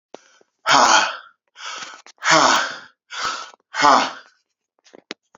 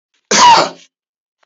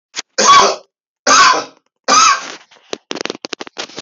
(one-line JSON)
{"exhalation_length": "5.4 s", "exhalation_amplitude": 32767, "exhalation_signal_mean_std_ratio": 0.43, "cough_length": "1.5 s", "cough_amplitude": 31550, "cough_signal_mean_std_ratio": 0.46, "three_cough_length": "4.0 s", "three_cough_amplitude": 32289, "three_cough_signal_mean_std_ratio": 0.48, "survey_phase": "beta (2021-08-13 to 2022-03-07)", "age": "45-64", "gender": "Male", "wearing_mask": "No", "symptom_cough_any": true, "smoker_status": "Never smoked", "respiratory_condition_asthma": false, "respiratory_condition_other": false, "recruitment_source": "REACT", "submission_delay": "3 days", "covid_test_result": "Negative", "covid_test_method": "RT-qPCR", "influenza_a_test_result": "Negative", "influenza_b_test_result": "Negative"}